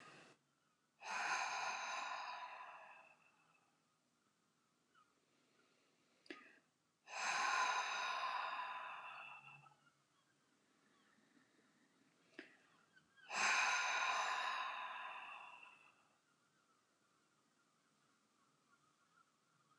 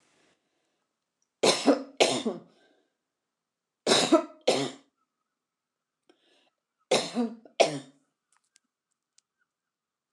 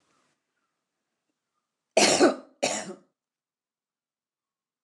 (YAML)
exhalation_length: 19.8 s
exhalation_amplitude: 1717
exhalation_signal_mean_std_ratio: 0.46
three_cough_length: 10.1 s
three_cough_amplitude: 16484
three_cough_signal_mean_std_ratio: 0.3
cough_length: 4.8 s
cough_amplitude: 16590
cough_signal_mean_std_ratio: 0.26
survey_phase: alpha (2021-03-01 to 2021-08-12)
age: 65+
gender: Female
wearing_mask: 'No'
symptom_fatigue: true
smoker_status: Never smoked
respiratory_condition_asthma: false
respiratory_condition_other: false
recruitment_source: REACT
submission_delay: 3 days
covid_test_result: Negative
covid_test_method: RT-qPCR